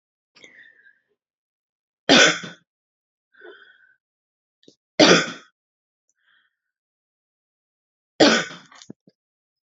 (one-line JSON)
{"three_cough_length": "9.6 s", "three_cough_amplitude": 31000, "three_cough_signal_mean_std_ratio": 0.23, "survey_phase": "beta (2021-08-13 to 2022-03-07)", "age": "18-44", "gender": "Female", "wearing_mask": "No", "symptom_none": true, "smoker_status": "Never smoked", "respiratory_condition_asthma": false, "respiratory_condition_other": false, "recruitment_source": "REACT", "submission_delay": "0 days", "covid_test_result": "Negative", "covid_test_method": "RT-qPCR"}